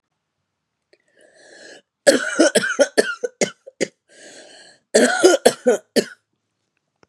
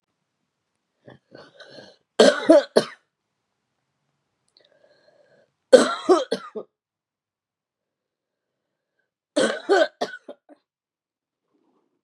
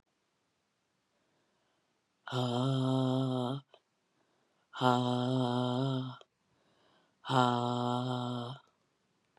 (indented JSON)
{
  "cough_length": "7.1 s",
  "cough_amplitude": 32768,
  "cough_signal_mean_std_ratio": 0.36,
  "three_cough_length": "12.0 s",
  "three_cough_amplitude": 32689,
  "three_cough_signal_mean_std_ratio": 0.24,
  "exhalation_length": "9.4 s",
  "exhalation_amplitude": 8441,
  "exhalation_signal_mean_std_ratio": 0.53,
  "survey_phase": "beta (2021-08-13 to 2022-03-07)",
  "age": "45-64",
  "gender": "Female",
  "wearing_mask": "No",
  "symptom_cough_any": true,
  "symptom_runny_or_blocked_nose": true,
  "symptom_shortness_of_breath": true,
  "symptom_sore_throat": true,
  "symptom_fatigue": true,
  "symptom_fever_high_temperature": true,
  "symptom_headache": true,
  "symptom_onset": "4 days",
  "smoker_status": "Never smoked",
  "respiratory_condition_asthma": false,
  "respiratory_condition_other": false,
  "recruitment_source": "Test and Trace",
  "submission_delay": "1 day",
  "covid_test_result": "Positive",
  "covid_test_method": "RT-qPCR",
  "covid_ct_value": 18.5,
  "covid_ct_gene": "ORF1ab gene"
}